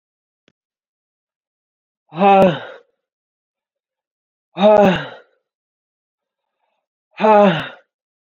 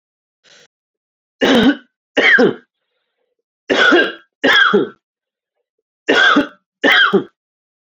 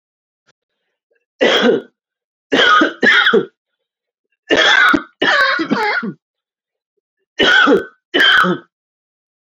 exhalation_length: 8.4 s
exhalation_amplitude: 27182
exhalation_signal_mean_std_ratio: 0.31
three_cough_length: 7.9 s
three_cough_amplitude: 30212
three_cough_signal_mean_std_ratio: 0.47
cough_length: 9.5 s
cough_amplitude: 29488
cough_signal_mean_std_ratio: 0.52
survey_phase: beta (2021-08-13 to 2022-03-07)
age: 18-44
gender: Male
wearing_mask: 'No'
symptom_headache: true
symptom_onset: 12 days
smoker_status: Never smoked
respiratory_condition_asthma: false
respiratory_condition_other: false
recruitment_source: REACT
submission_delay: 2 days
covid_test_result: Negative
covid_test_method: RT-qPCR
influenza_a_test_result: Negative
influenza_b_test_result: Negative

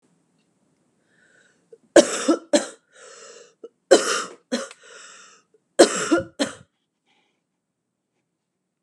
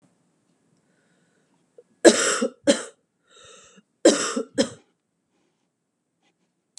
three_cough_length: 8.8 s
three_cough_amplitude: 32701
three_cough_signal_mean_std_ratio: 0.26
cough_length: 6.8 s
cough_amplitude: 32766
cough_signal_mean_std_ratio: 0.25
survey_phase: beta (2021-08-13 to 2022-03-07)
age: 18-44
gender: Female
wearing_mask: 'No'
symptom_runny_or_blocked_nose: true
smoker_status: Never smoked
respiratory_condition_asthma: false
respiratory_condition_other: false
recruitment_source: REACT
submission_delay: 4 days
covid_test_result: Negative
covid_test_method: RT-qPCR
influenza_a_test_result: Unknown/Void
influenza_b_test_result: Unknown/Void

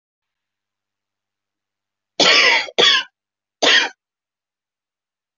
cough_length: 5.4 s
cough_amplitude: 27619
cough_signal_mean_std_ratio: 0.34
survey_phase: beta (2021-08-13 to 2022-03-07)
age: 45-64
gender: Female
wearing_mask: 'No'
symptom_cough_any: true
symptom_shortness_of_breath: true
symptom_abdominal_pain: true
symptom_fatigue: true
symptom_headache: true
symptom_other: true
symptom_onset: 13 days
smoker_status: Ex-smoker
respiratory_condition_asthma: true
respiratory_condition_other: false
recruitment_source: REACT
submission_delay: 1 day
covid_test_result: Negative
covid_test_method: RT-qPCR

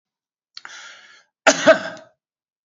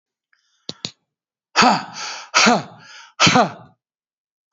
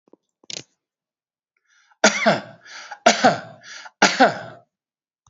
cough_length: 2.6 s
cough_amplitude: 27968
cough_signal_mean_std_ratio: 0.26
exhalation_length: 4.5 s
exhalation_amplitude: 30164
exhalation_signal_mean_std_ratio: 0.37
three_cough_length: 5.3 s
three_cough_amplitude: 31755
three_cough_signal_mean_std_ratio: 0.33
survey_phase: beta (2021-08-13 to 2022-03-07)
age: 65+
gender: Male
wearing_mask: 'No'
symptom_none: true
smoker_status: Ex-smoker
respiratory_condition_asthma: false
respiratory_condition_other: false
recruitment_source: REACT
submission_delay: 4 days
covid_test_result: Negative
covid_test_method: RT-qPCR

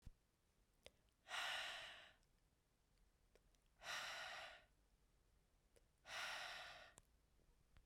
exhalation_length: 7.9 s
exhalation_amplitude: 494
exhalation_signal_mean_std_ratio: 0.5
survey_phase: beta (2021-08-13 to 2022-03-07)
age: 18-44
gender: Female
wearing_mask: 'No'
symptom_cough_any: true
symptom_runny_or_blocked_nose: true
symptom_fatigue: true
symptom_fever_high_temperature: true
symptom_headache: true
symptom_change_to_sense_of_smell_or_taste: true
symptom_other: true
symptom_onset: 2 days
smoker_status: Ex-smoker
respiratory_condition_asthma: false
respiratory_condition_other: false
recruitment_source: Test and Trace
submission_delay: 2 days
covid_test_result: Positive
covid_test_method: RT-qPCR
covid_ct_value: 15.4
covid_ct_gene: ORF1ab gene
covid_ct_mean: 16.9
covid_viral_load: 3000000 copies/ml
covid_viral_load_category: High viral load (>1M copies/ml)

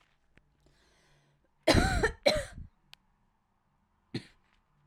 cough_length: 4.9 s
cough_amplitude: 10552
cough_signal_mean_std_ratio: 0.29
survey_phase: beta (2021-08-13 to 2022-03-07)
age: 18-44
gender: Female
wearing_mask: 'No'
symptom_none: true
smoker_status: Current smoker (e-cigarettes or vapes only)
respiratory_condition_asthma: false
respiratory_condition_other: false
recruitment_source: REACT
submission_delay: 0 days
covid_test_result: Negative
covid_test_method: RT-qPCR
influenza_a_test_result: Negative
influenza_b_test_result: Negative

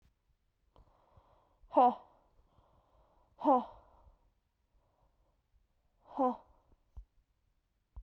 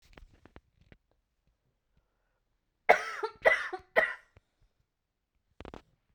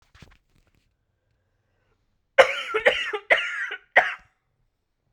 exhalation_length: 8.0 s
exhalation_amplitude: 5846
exhalation_signal_mean_std_ratio: 0.22
cough_length: 6.1 s
cough_amplitude: 15232
cough_signal_mean_std_ratio: 0.23
three_cough_length: 5.1 s
three_cough_amplitude: 32767
three_cough_signal_mean_std_ratio: 0.3
survey_phase: beta (2021-08-13 to 2022-03-07)
age: 18-44
gender: Female
wearing_mask: 'No'
symptom_cough_any: true
symptom_new_continuous_cough: true
symptom_runny_or_blocked_nose: true
symptom_sore_throat: true
symptom_fatigue: true
symptom_fever_high_temperature: true
symptom_headache: true
symptom_onset: 3 days
smoker_status: Never smoked
respiratory_condition_asthma: false
respiratory_condition_other: false
recruitment_source: Test and Trace
submission_delay: 1 day
covid_test_result: Positive
covid_test_method: RT-qPCR
covid_ct_value: 15.8
covid_ct_gene: ORF1ab gene
covid_ct_mean: 16.3
covid_viral_load: 4600000 copies/ml
covid_viral_load_category: High viral load (>1M copies/ml)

